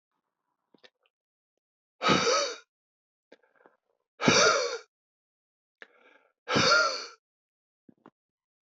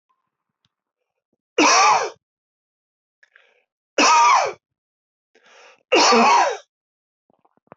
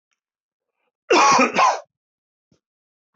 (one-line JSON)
{"exhalation_length": "8.6 s", "exhalation_amplitude": 13981, "exhalation_signal_mean_std_ratio": 0.34, "three_cough_length": "7.8 s", "three_cough_amplitude": 20887, "three_cough_signal_mean_std_ratio": 0.4, "cough_length": "3.2 s", "cough_amplitude": 20401, "cough_signal_mean_std_ratio": 0.38, "survey_phase": "beta (2021-08-13 to 2022-03-07)", "age": "45-64", "gender": "Male", "wearing_mask": "No", "symptom_cough_any": true, "symptom_runny_or_blocked_nose": true, "symptom_sore_throat": true, "symptom_onset": "4 days", "smoker_status": "Never smoked", "respiratory_condition_asthma": false, "respiratory_condition_other": false, "recruitment_source": "Test and Trace", "submission_delay": "0 days", "covid_test_result": "Positive", "covid_test_method": "RT-qPCR", "covid_ct_value": 16.0, "covid_ct_gene": "ORF1ab gene", "covid_ct_mean": 16.6, "covid_viral_load": "3700000 copies/ml", "covid_viral_load_category": "High viral load (>1M copies/ml)"}